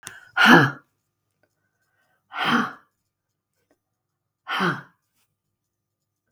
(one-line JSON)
{"exhalation_length": "6.3 s", "exhalation_amplitude": 32766, "exhalation_signal_mean_std_ratio": 0.27, "survey_phase": "beta (2021-08-13 to 2022-03-07)", "age": "65+", "gender": "Female", "wearing_mask": "No", "symptom_runny_or_blocked_nose": true, "smoker_status": "Never smoked", "respiratory_condition_asthma": false, "respiratory_condition_other": false, "recruitment_source": "REACT", "submission_delay": "1 day", "covid_test_result": "Negative", "covid_test_method": "RT-qPCR"}